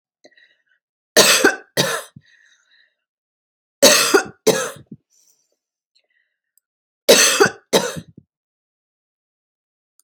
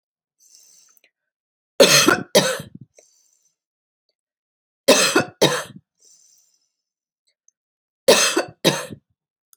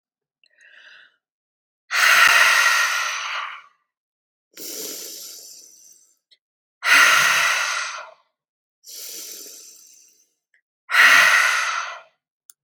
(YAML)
cough_length: 10.0 s
cough_amplitude: 32767
cough_signal_mean_std_ratio: 0.32
three_cough_length: 9.6 s
three_cough_amplitude: 29716
three_cough_signal_mean_std_ratio: 0.31
exhalation_length: 12.6 s
exhalation_amplitude: 27049
exhalation_signal_mean_std_ratio: 0.45
survey_phase: alpha (2021-03-01 to 2021-08-12)
age: 45-64
gender: Female
wearing_mask: 'No'
symptom_headache: true
smoker_status: Never smoked
respiratory_condition_asthma: false
respiratory_condition_other: false
recruitment_source: REACT
submission_delay: 1 day
covid_test_result: Negative
covid_test_method: RT-qPCR